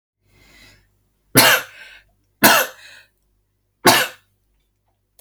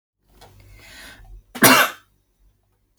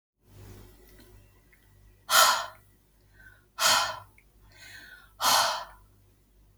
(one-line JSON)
{"three_cough_length": "5.2 s", "three_cough_amplitude": 32768, "three_cough_signal_mean_std_ratio": 0.3, "cough_length": "3.0 s", "cough_amplitude": 32768, "cough_signal_mean_std_ratio": 0.27, "exhalation_length": "6.6 s", "exhalation_amplitude": 19012, "exhalation_signal_mean_std_ratio": 0.35, "survey_phase": "alpha (2021-03-01 to 2021-08-12)", "age": "18-44", "gender": "Female", "wearing_mask": "No", "symptom_none": true, "smoker_status": "Never smoked", "respiratory_condition_asthma": false, "respiratory_condition_other": false, "recruitment_source": "REACT", "submission_delay": "1 day", "covid_test_result": "Negative", "covid_test_method": "RT-qPCR"}